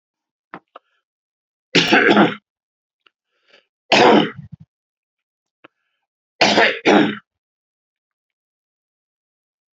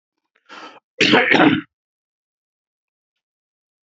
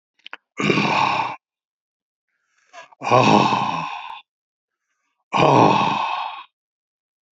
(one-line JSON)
{"three_cough_length": "9.7 s", "three_cough_amplitude": 32768, "three_cough_signal_mean_std_ratio": 0.32, "cough_length": "3.8 s", "cough_amplitude": 29914, "cough_signal_mean_std_ratio": 0.32, "exhalation_length": "7.3 s", "exhalation_amplitude": 27314, "exhalation_signal_mean_std_ratio": 0.47, "survey_phase": "beta (2021-08-13 to 2022-03-07)", "age": "65+", "gender": "Male", "wearing_mask": "No", "symptom_cough_any": true, "smoker_status": "Ex-smoker", "respiratory_condition_asthma": false, "respiratory_condition_other": true, "recruitment_source": "REACT", "submission_delay": "1 day", "covid_test_result": "Negative", "covid_test_method": "RT-qPCR"}